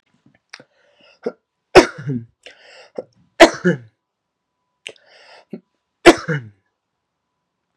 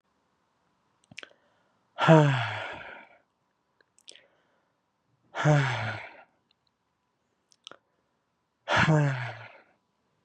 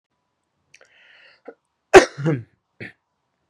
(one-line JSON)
{"three_cough_length": "7.8 s", "three_cough_amplitude": 32768, "three_cough_signal_mean_std_ratio": 0.21, "exhalation_length": "10.2 s", "exhalation_amplitude": 20954, "exhalation_signal_mean_std_ratio": 0.31, "cough_length": "3.5 s", "cough_amplitude": 32768, "cough_signal_mean_std_ratio": 0.19, "survey_phase": "beta (2021-08-13 to 2022-03-07)", "age": "18-44", "gender": "Male", "wearing_mask": "No", "symptom_cough_any": true, "symptom_sore_throat": true, "symptom_diarrhoea": true, "symptom_fatigue": true, "symptom_headache": true, "symptom_onset": "2 days", "smoker_status": "Never smoked", "respiratory_condition_asthma": false, "respiratory_condition_other": false, "recruitment_source": "Test and Trace", "submission_delay": "1 day", "covid_test_result": "Positive", "covid_test_method": "RT-qPCR", "covid_ct_value": 19.6, "covid_ct_gene": "N gene"}